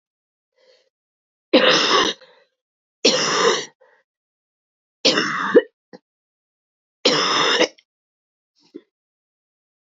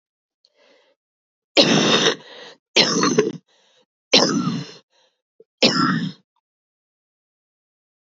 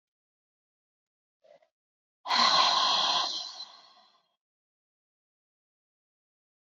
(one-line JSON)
{"three_cough_length": "9.8 s", "three_cough_amplitude": 27878, "three_cough_signal_mean_std_ratio": 0.38, "cough_length": "8.2 s", "cough_amplitude": 32768, "cough_signal_mean_std_ratio": 0.4, "exhalation_length": "6.7 s", "exhalation_amplitude": 10397, "exhalation_signal_mean_std_ratio": 0.35, "survey_phase": "beta (2021-08-13 to 2022-03-07)", "age": "18-44", "gender": "Female", "wearing_mask": "No", "symptom_cough_any": true, "symptom_sore_throat": true, "symptom_fatigue": true, "symptom_fever_high_temperature": true, "symptom_headache": true, "symptom_change_to_sense_of_smell_or_taste": true, "symptom_loss_of_taste": true, "symptom_onset": "7 days", "smoker_status": "Ex-smoker", "respiratory_condition_asthma": false, "respiratory_condition_other": false, "recruitment_source": "Test and Trace", "submission_delay": "2 days", "covid_test_result": "Positive", "covid_test_method": "RT-qPCR", "covid_ct_value": 20.1, "covid_ct_gene": "ORF1ab gene", "covid_ct_mean": 21.2, "covid_viral_load": "110000 copies/ml", "covid_viral_load_category": "Low viral load (10K-1M copies/ml)"}